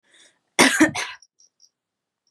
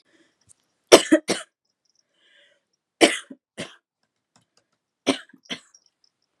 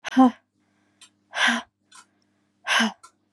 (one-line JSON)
{"cough_length": "2.3 s", "cough_amplitude": 31210, "cough_signal_mean_std_ratio": 0.31, "three_cough_length": "6.4 s", "three_cough_amplitude": 32768, "three_cough_signal_mean_std_ratio": 0.19, "exhalation_length": "3.3 s", "exhalation_amplitude": 19856, "exhalation_signal_mean_std_ratio": 0.35, "survey_phase": "beta (2021-08-13 to 2022-03-07)", "age": "18-44", "gender": "Female", "wearing_mask": "No", "symptom_fatigue": true, "symptom_headache": true, "smoker_status": "Never smoked", "respiratory_condition_asthma": false, "respiratory_condition_other": false, "recruitment_source": "REACT", "submission_delay": "1 day", "covid_test_result": "Negative", "covid_test_method": "RT-qPCR", "influenza_a_test_result": "Negative", "influenza_b_test_result": "Negative"}